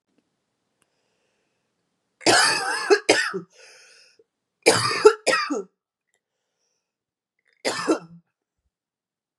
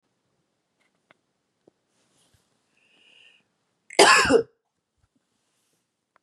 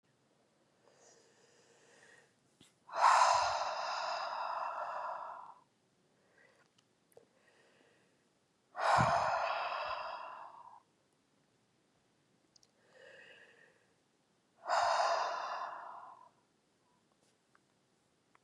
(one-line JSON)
{"three_cough_length": "9.4 s", "three_cough_amplitude": 32717, "three_cough_signal_mean_std_ratio": 0.33, "cough_length": "6.2 s", "cough_amplitude": 30948, "cough_signal_mean_std_ratio": 0.21, "exhalation_length": "18.4 s", "exhalation_amplitude": 5443, "exhalation_signal_mean_std_ratio": 0.4, "survey_phase": "beta (2021-08-13 to 2022-03-07)", "age": "18-44", "gender": "Female", "wearing_mask": "No", "symptom_cough_any": true, "symptom_runny_or_blocked_nose": true, "symptom_diarrhoea": true, "symptom_fatigue": true, "symptom_headache": true, "symptom_change_to_sense_of_smell_or_taste": true, "symptom_loss_of_taste": true, "symptom_other": true, "symptom_onset": "6 days", "smoker_status": "Never smoked", "respiratory_condition_asthma": false, "respiratory_condition_other": false, "recruitment_source": "Test and Trace", "submission_delay": "1 day", "covid_test_result": "Positive", "covid_test_method": "RT-qPCR", "covid_ct_value": 23.4, "covid_ct_gene": "ORF1ab gene", "covid_ct_mean": 23.7, "covid_viral_load": "16000 copies/ml", "covid_viral_load_category": "Low viral load (10K-1M copies/ml)"}